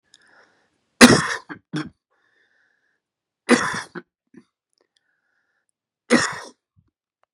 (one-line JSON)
{"three_cough_length": "7.3 s", "three_cough_amplitude": 32768, "three_cough_signal_mean_std_ratio": 0.23, "survey_phase": "beta (2021-08-13 to 2022-03-07)", "age": "45-64", "gender": "Male", "wearing_mask": "No", "symptom_cough_any": true, "symptom_runny_or_blocked_nose": true, "symptom_sore_throat": true, "symptom_fever_high_temperature": true, "symptom_headache": true, "symptom_onset": "3 days", "smoker_status": "Never smoked", "respiratory_condition_asthma": false, "respiratory_condition_other": false, "recruitment_source": "Test and Trace", "submission_delay": "1 day", "covid_test_result": "Negative", "covid_test_method": "ePCR"}